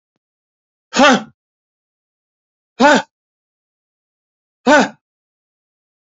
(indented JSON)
{
  "exhalation_length": "6.1 s",
  "exhalation_amplitude": 29089,
  "exhalation_signal_mean_std_ratio": 0.26,
  "survey_phase": "beta (2021-08-13 to 2022-03-07)",
  "age": "45-64",
  "gender": "Male",
  "wearing_mask": "No",
  "symptom_cough_any": true,
  "symptom_runny_or_blocked_nose": true,
  "symptom_shortness_of_breath": true,
  "symptom_fatigue": true,
  "smoker_status": "Ex-smoker",
  "respiratory_condition_asthma": false,
  "respiratory_condition_other": true,
  "recruitment_source": "Test and Trace",
  "submission_delay": "1 day",
  "covid_test_result": "Negative",
  "covid_test_method": "ePCR"
}